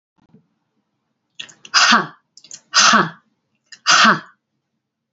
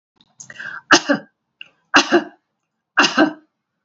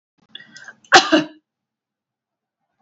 exhalation_length: 5.1 s
exhalation_amplitude: 32768
exhalation_signal_mean_std_ratio: 0.36
three_cough_length: 3.8 s
three_cough_amplitude: 32659
three_cough_signal_mean_std_ratio: 0.35
cough_length: 2.8 s
cough_amplitude: 30521
cough_signal_mean_std_ratio: 0.24
survey_phase: beta (2021-08-13 to 2022-03-07)
age: 45-64
gender: Female
wearing_mask: 'No'
symptom_none: true
smoker_status: Never smoked
respiratory_condition_asthma: false
respiratory_condition_other: false
recruitment_source: REACT
submission_delay: 2 days
covid_test_result: Negative
covid_test_method: RT-qPCR
influenza_a_test_result: Negative
influenza_b_test_result: Negative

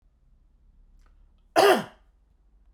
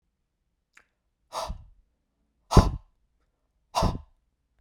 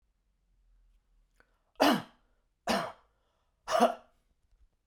cough_length: 2.7 s
cough_amplitude: 20304
cough_signal_mean_std_ratio: 0.27
exhalation_length: 4.6 s
exhalation_amplitude: 27456
exhalation_signal_mean_std_ratio: 0.22
three_cough_length: 4.9 s
three_cough_amplitude: 12154
three_cough_signal_mean_std_ratio: 0.28
survey_phase: beta (2021-08-13 to 2022-03-07)
age: 45-64
gender: Male
wearing_mask: 'No'
symptom_none: true
smoker_status: Never smoked
respiratory_condition_asthma: false
respiratory_condition_other: false
recruitment_source: REACT
submission_delay: 2 days
covid_test_result: Negative
covid_test_method: RT-qPCR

